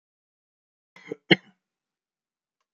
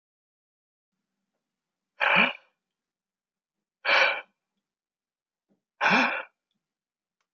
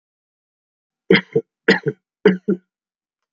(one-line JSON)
{"cough_length": "2.7 s", "cough_amplitude": 24605, "cough_signal_mean_std_ratio": 0.11, "exhalation_length": "7.3 s", "exhalation_amplitude": 12632, "exhalation_signal_mean_std_ratio": 0.29, "three_cough_length": "3.3 s", "three_cough_amplitude": 32768, "three_cough_signal_mean_std_ratio": 0.29, "survey_phase": "beta (2021-08-13 to 2022-03-07)", "age": "65+", "gender": "Male", "wearing_mask": "No", "symptom_none": true, "smoker_status": "Never smoked", "respiratory_condition_asthma": false, "respiratory_condition_other": false, "recruitment_source": "REACT", "submission_delay": "1 day", "covid_test_result": "Negative", "covid_test_method": "RT-qPCR", "influenza_a_test_result": "Negative", "influenza_b_test_result": "Negative"}